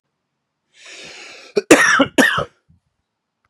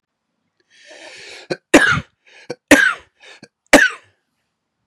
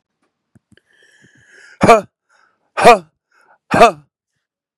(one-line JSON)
{"cough_length": "3.5 s", "cough_amplitude": 32768, "cough_signal_mean_std_ratio": 0.35, "three_cough_length": "4.9 s", "three_cough_amplitude": 32768, "three_cough_signal_mean_std_ratio": 0.3, "exhalation_length": "4.8 s", "exhalation_amplitude": 32768, "exhalation_signal_mean_std_ratio": 0.27, "survey_phase": "beta (2021-08-13 to 2022-03-07)", "age": "18-44", "gender": "Male", "wearing_mask": "No", "symptom_cough_any": true, "symptom_runny_or_blocked_nose": true, "symptom_shortness_of_breath": true, "symptom_onset": "12 days", "smoker_status": "Never smoked", "respiratory_condition_asthma": true, "respiratory_condition_other": false, "recruitment_source": "REACT", "submission_delay": "1 day", "covid_test_result": "Negative", "covid_test_method": "RT-qPCR"}